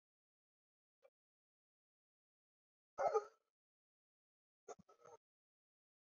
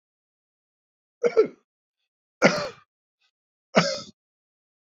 {"exhalation_length": "6.1 s", "exhalation_amplitude": 1746, "exhalation_signal_mean_std_ratio": 0.16, "three_cough_length": "4.9 s", "three_cough_amplitude": 26354, "three_cough_signal_mean_std_ratio": 0.26, "survey_phase": "beta (2021-08-13 to 2022-03-07)", "age": "65+", "gender": "Male", "wearing_mask": "No", "symptom_fatigue": true, "smoker_status": "Ex-smoker", "respiratory_condition_asthma": false, "respiratory_condition_other": true, "recruitment_source": "REACT", "submission_delay": "12 days", "covid_test_result": "Negative", "covid_test_method": "RT-qPCR", "influenza_a_test_result": "Unknown/Void", "influenza_b_test_result": "Unknown/Void"}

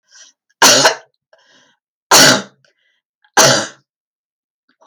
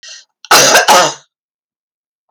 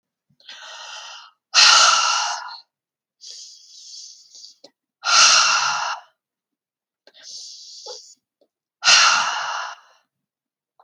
{"three_cough_length": "4.9 s", "three_cough_amplitude": 32768, "three_cough_signal_mean_std_ratio": 0.36, "cough_length": "2.3 s", "cough_amplitude": 32768, "cough_signal_mean_std_ratio": 0.46, "exhalation_length": "10.8 s", "exhalation_amplitude": 31476, "exhalation_signal_mean_std_ratio": 0.4, "survey_phase": "alpha (2021-03-01 to 2021-08-12)", "age": "45-64", "gender": "Female", "wearing_mask": "No", "symptom_abdominal_pain": true, "symptom_fatigue": true, "symptom_onset": "12 days", "smoker_status": "Never smoked", "respiratory_condition_asthma": false, "respiratory_condition_other": false, "recruitment_source": "REACT", "submission_delay": "1 day", "covid_test_result": "Negative", "covid_test_method": "RT-qPCR"}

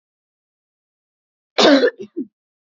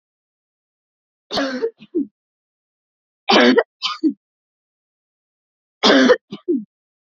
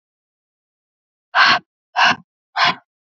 {"cough_length": "2.6 s", "cough_amplitude": 29829, "cough_signal_mean_std_ratio": 0.31, "three_cough_length": "7.1 s", "three_cough_amplitude": 30372, "three_cough_signal_mean_std_ratio": 0.35, "exhalation_length": "3.2 s", "exhalation_amplitude": 28515, "exhalation_signal_mean_std_ratio": 0.35, "survey_phase": "beta (2021-08-13 to 2022-03-07)", "age": "18-44", "gender": "Female", "wearing_mask": "No", "symptom_fatigue": true, "symptom_headache": true, "smoker_status": "Never smoked", "respiratory_condition_asthma": false, "respiratory_condition_other": false, "recruitment_source": "REACT", "submission_delay": "3 days", "covid_test_result": "Negative", "covid_test_method": "RT-qPCR", "influenza_a_test_result": "Negative", "influenza_b_test_result": "Negative"}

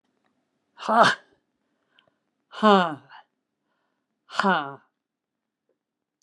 {"exhalation_length": "6.2 s", "exhalation_amplitude": 23596, "exhalation_signal_mean_std_ratio": 0.27, "survey_phase": "beta (2021-08-13 to 2022-03-07)", "age": "65+", "gender": "Female", "wearing_mask": "No", "symptom_cough_any": true, "symptom_shortness_of_breath": true, "symptom_fatigue": true, "symptom_onset": "5 days", "smoker_status": "Never smoked", "respiratory_condition_asthma": false, "respiratory_condition_other": false, "recruitment_source": "REACT", "submission_delay": "1 day", "covid_test_result": "Negative", "covid_test_method": "RT-qPCR"}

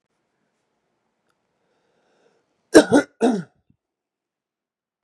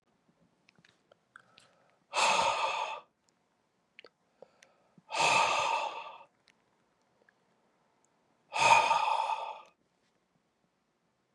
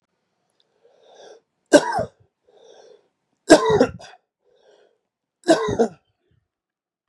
{"cough_length": "5.0 s", "cough_amplitude": 32768, "cough_signal_mean_std_ratio": 0.19, "exhalation_length": "11.3 s", "exhalation_amplitude": 10098, "exhalation_signal_mean_std_ratio": 0.38, "three_cough_length": "7.1 s", "three_cough_amplitude": 32768, "three_cough_signal_mean_std_ratio": 0.27, "survey_phase": "beta (2021-08-13 to 2022-03-07)", "age": "45-64", "gender": "Male", "wearing_mask": "No", "symptom_fatigue": true, "symptom_headache": true, "symptom_onset": "6 days", "smoker_status": "Ex-smoker", "respiratory_condition_asthma": false, "respiratory_condition_other": false, "recruitment_source": "REACT", "submission_delay": "1 day", "covid_test_result": "Positive", "covid_test_method": "RT-qPCR", "covid_ct_value": 21.0, "covid_ct_gene": "E gene", "influenza_a_test_result": "Negative", "influenza_b_test_result": "Negative"}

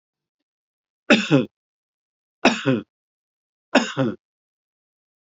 {"three_cough_length": "5.2 s", "three_cough_amplitude": 29984, "three_cough_signal_mean_std_ratio": 0.3, "survey_phase": "beta (2021-08-13 to 2022-03-07)", "age": "65+", "gender": "Male", "wearing_mask": "No", "symptom_none": true, "smoker_status": "Ex-smoker", "respiratory_condition_asthma": true, "respiratory_condition_other": false, "recruitment_source": "REACT", "submission_delay": "1 day", "covid_test_result": "Negative", "covid_test_method": "RT-qPCR", "influenza_a_test_result": "Negative", "influenza_b_test_result": "Negative"}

